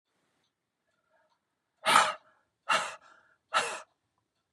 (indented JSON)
{
  "exhalation_length": "4.5 s",
  "exhalation_amplitude": 16324,
  "exhalation_signal_mean_std_ratio": 0.29,
  "survey_phase": "beta (2021-08-13 to 2022-03-07)",
  "age": "45-64",
  "gender": "Female",
  "wearing_mask": "No",
  "symptom_cough_any": true,
  "symptom_change_to_sense_of_smell_or_taste": true,
  "symptom_loss_of_taste": true,
  "smoker_status": "Ex-smoker",
  "respiratory_condition_asthma": false,
  "respiratory_condition_other": false,
  "recruitment_source": "Test and Trace",
  "submission_delay": "2 days",
  "covid_test_result": "Positive",
  "covid_test_method": "RT-qPCR"
}